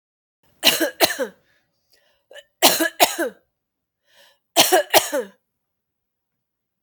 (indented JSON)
{
  "three_cough_length": "6.8 s",
  "three_cough_amplitude": 31975,
  "three_cough_signal_mean_std_ratio": 0.34,
  "survey_phase": "alpha (2021-03-01 to 2021-08-12)",
  "age": "45-64",
  "gender": "Female",
  "wearing_mask": "No",
  "symptom_cough_any": true,
  "smoker_status": "Ex-smoker",
  "respiratory_condition_asthma": true,
  "respiratory_condition_other": false,
  "recruitment_source": "REACT",
  "submission_delay": "2 days",
  "covid_test_result": "Negative",
  "covid_test_method": "RT-qPCR"
}